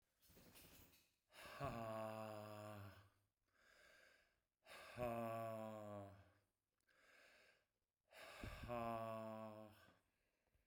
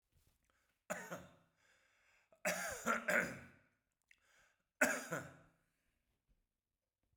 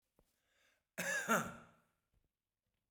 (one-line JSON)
{"exhalation_length": "10.7 s", "exhalation_amplitude": 579, "exhalation_signal_mean_std_ratio": 0.56, "three_cough_length": "7.2 s", "three_cough_amplitude": 3846, "three_cough_signal_mean_std_ratio": 0.33, "cough_length": "2.9 s", "cough_amplitude": 2872, "cough_signal_mean_std_ratio": 0.33, "survey_phase": "beta (2021-08-13 to 2022-03-07)", "age": "45-64", "gender": "Male", "wearing_mask": "No", "symptom_runny_or_blocked_nose": true, "symptom_sore_throat": true, "symptom_fatigue": true, "symptom_headache": true, "symptom_onset": "4 days", "smoker_status": "Ex-smoker", "respiratory_condition_asthma": false, "respiratory_condition_other": false, "recruitment_source": "Test and Trace", "submission_delay": "2 days", "covid_test_result": "Positive", "covid_test_method": "RT-qPCR"}